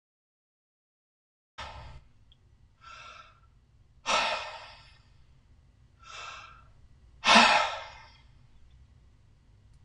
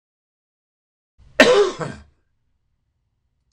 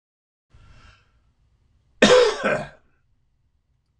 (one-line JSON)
{"exhalation_length": "9.8 s", "exhalation_amplitude": 16138, "exhalation_signal_mean_std_ratio": 0.27, "three_cough_length": "3.5 s", "three_cough_amplitude": 26028, "three_cough_signal_mean_std_ratio": 0.26, "cough_length": "4.0 s", "cough_amplitude": 26028, "cough_signal_mean_std_ratio": 0.29, "survey_phase": "alpha (2021-03-01 to 2021-08-12)", "age": "65+", "gender": "Male", "wearing_mask": "No", "symptom_none": true, "smoker_status": "Ex-smoker", "respiratory_condition_asthma": false, "respiratory_condition_other": false, "recruitment_source": "REACT", "submission_delay": "3 days", "covid_test_result": "Negative", "covid_test_method": "RT-qPCR"}